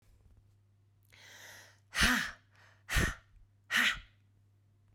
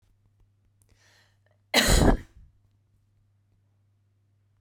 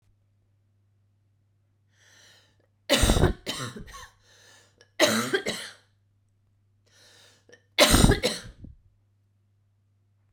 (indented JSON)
{
  "exhalation_length": "4.9 s",
  "exhalation_amplitude": 6632,
  "exhalation_signal_mean_std_ratio": 0.36,
  "cough_length": "4.6 s",
  "cough_amplitude": 18102,
  "cough_signal_mean_std_ratio": 0.26,
  "three_cough_length": "10.3 s",
  "three_cough_amplitude": 26756,
  "three_cough_signal_mean_std_ratio": 0.31,
  "survey_phase": "beta (2021-08-13 to 2022-03-07)",
  "age": "18-44",
  "gender": "Female",
  "wearing_mask": "No",
  "symptom_fatigue": true,
  "smoker_status": "Ex-smoker",
  "respiratory_condition_asthma": false,
  "respiratory_condition_other": false,
  "recruitment_source": "REACT",
  "submission_delay": "1 day",
  "covid_test_result": "Negative",
  "covid_test_method": "RT-qPCR"
}